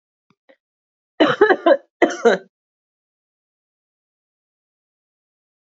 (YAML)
cough_length: 5.7 s
cough_amplitude: 27552
cough_signal_mean_std_ratio: 0.26
survey_phase: beta (2021-08-13 to 2022-03-07)
age: 45-64
gender: Female
wearing_mask: 'No'
symptom_cough_any: true
symptom_fatigue: true
smoker_status: Never smoked
respiratory_condition_asthma: false
respiratory_condition_other: false
recruitment_source: Test and Trace
submission_delay: 3 days
covid_test_result: Positive
covid_test_method: RT-qPCR
covid_ct_value: 17.2
covid_ct_gene: ORF1ab gene
covid_ct_mean: 17.8
covid_viral_load: 1500000 copies/ml
covid_viral_load_category: High viral load (>1M copies/ml)